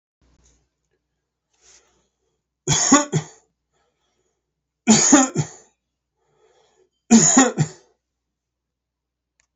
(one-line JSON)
{"three_cough_length": "9.6 s", "three_cough_amplitude": 29642, "three_cough_signal_mean_std_ratio": 0.3, "survey_phase": "beta (2021-08-13 to 2022-03-07)", "age": "65+", "gender": "Male", "wearing_mask": "Yes", "symptom_other": true, "smoker_status": "Never smoked", "respiratory_condition_asthma": false, "respiratory_condition_other": false, "recruitment_source": "Test and Trace", "submission_delay": "2 days", "covid_test_result": "Positive", "covid_test_method": "RT-qPCR", "covid_ct_value": 27.5, "covid_ct_gene": "ORF1ab gene", "covid_ct_mean": 28.4, "covid_viral_load": "500 copies/ml", "covid_viral_load_category": "Minimal viral load (< 10K copies/ml)"}